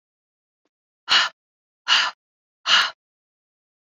{"exhalation_length": "3.8 s", "exhalation_amplitude": 22974, "exhalation_signal_mean_std_ratio": 0.31, "survey_phase": "beta (2021-08-13 to 2022-03-07)", "age": "45-64", "gender": "Female", "wearing_mask": "No", "symptom_runny_or_blocked_nose": true, "symptom_shortness_of_breath": true, "symptom_sore_throat": true, "symptom_fatigue": true, "symptom_headache": true, "symptom_onset": "3 days", "smoker_status": "Ex-smoker", "respiratory_condition_asthma": false, "respiratory_condition_other": false, "recruitment_source": "Test and Trace", "submission_delay": "2 days", "covid_test_result": "Positive", "covid_test_method": "RT-qPCR", "covid_ct_value": 31.8, "covid_ct_gene": "ORF1ab gene", "covid_ct_mean": 31.9, "covid_viral_load": "35 copies/ml", "covid_viral_load_category": "Minimal viral load (< 10K copies/ml)"}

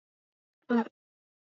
{"cough_length": "1.5 s", "cough_amplitude": 4976, "cough_signal_mean_std_ratio": 0.24, "survey_phase": "beta (2021-08-13 to 2022-03-07)", "age": "18-44", "gender": "Female", "wearing_mask": "No", "symptom_sore_throat": true, "symptom_fatigue": true, "symptom_headache": true, "symptom_onset": "5 days", "smoker_status": "Never smoked", "respiratory_condition_asthma": false, "respiratory_condition_other": false, "recruitment_source": "REACT", "submission_delay": "2 days", "covid_test_result": "Negative", "covid_test_method": "RT-qPCR", "influenza_a_test_result": "Negative", "influenza_b_test_result": "Negative"}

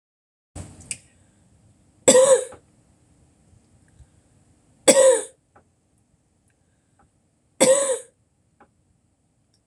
{"three_cough_length": "9.7 s", "three_cough_amplitude": 26028, "three_cough_signal_mean_std_ratio": 0.27, "survey_phase": "alpha (2021-03-01 to 2021-08-12)", "age": "45-64", "gender": "Female", "wearing_mask": "No", "symptom_cough_any": true, "symptom_headache": true, "smoker_status": "Never smoked", "respiratory_condition_asthma": true, "respiratory_condition_other": false, "recruitment_source": "REACT", "submission_delay": "1 day", "covid_test_result": "Negative", "covid_test_method": "RT-qPCR"}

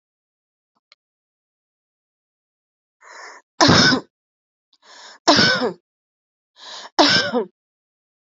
{"three_cough_length": "8.3 s", "three_cough_amplitude": 31892, "three_cough_signal_mean_std_ratio": 0.31, "survey_phase": "alpha (2021-03-01 to 2021-08-12)", "age": "45-64", "gender": "Female", "wearing_mask": "No", "symptom_none": true, "smoker_status": "Never smoked", "respiratory_condition_asthma": true, "respiratory_condition_other": false, "recruitment_source": "REACT", "submission_delay": "3 days", "covid_test_result": "Negative", "covid_test_method": "RT-qPCR", "covid_ct_value": 46.0, "covid_ct_gene": "N gene"}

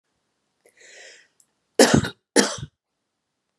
{"cough_length": "3.6 s", "cough_amplitude": 31918, "cough_signal_mean_std_ratio": 0.25, "survey_phase": "beta (2021-08-13 to 2022-03-07)", "age": "18-44", "gender": "Female", "wearing_mask": "No", "symptom_cough_any": true, "symptom_runny_or_blocked_nose": true, "symptom_shortness_of_breath": true, "symptom_sore_throat": true, "symptom_abdominal_pain": true, "symptom_fatigue": true, "symptom_fever_high_temperature": true, "symptom_headache": true, "symptom_onset": "3 days", "smoker_status": "Ex-smoker", "respiratory_condition_asthma": false, "respiratory_condition_other": false, "recruitment_source": "Test and Trace", "submission_delay": "2 days", "covid_test_result": "Positive", "covid_test_method": "RT-qPCR", "covid_ct_value": 26.4, "covid_ct_gene": "ORF1ab gene"}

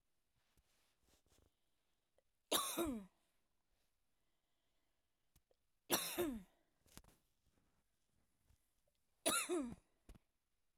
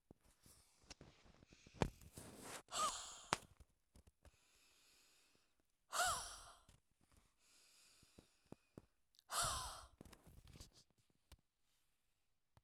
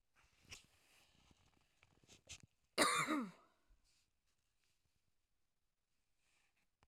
{"three_cough_length": "10.8 s", "three_cough_amplitude": 2916, "three_cough_signal_mean_std_ratio": 0.3, "exhalation_length": "12.6 s", "exhalation_amplitude": 7269, "exhalation_signal_mean_std_ratio": 0.32, "cough_length": "6.9 s", "cough_amplitude": 3474, "cough_signal_mean_std_ratio": 0.24, "survey_phase": "beta (2021-08-13 to 2022-03-07)", "age": "45-64", "gender": "Female", "wearing_mask": "No", "symptom_runny_or_blocked_nose": true, "smoker_status": "Ex-smoker", "respiratory_condition_asthma": false, "respiratory_condition_other": false, "recruitment_source": "REACT", "submission_delay": "1 day", "covid_test_result": "Negative", "covid_test_method": "RT-qPCR", "influenza_a_test_result": "Unknown/Void", "influenza_b_test_result": "Unknown/Void"}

